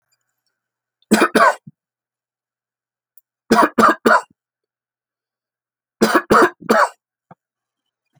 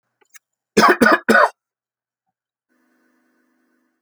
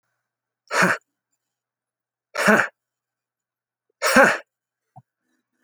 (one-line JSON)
{"three_cough_length": "8.2 s", "three_cough_amplitude": 31823, "three_cough_signal_mean_std_ratio": 0.33, "cough_length": "4.0 s", "cough_amplitude": 31364, "cough_signal_mean_std_ratio": 0.3, "exhalation_length": "5.6 s", "exhalation_amplitude": 30590, "exhalation_signal_mean_std_ratio": 0.29, "survey_phase": "alpha (2021-03-01 to 2021-08-12)", "age": "45-64", "gender": "Male", "wearing_mask": "No", "symptom_cough_any": true, "smoker_status": "Never smoked", "respiratory_condition_asthma": false, "respiratory_condition_other": false, "recruitment_source": "REACT", "submission_delay": "4 days", "covid_test_result": "Negative", "covid_test_method": "RT-qPCR"}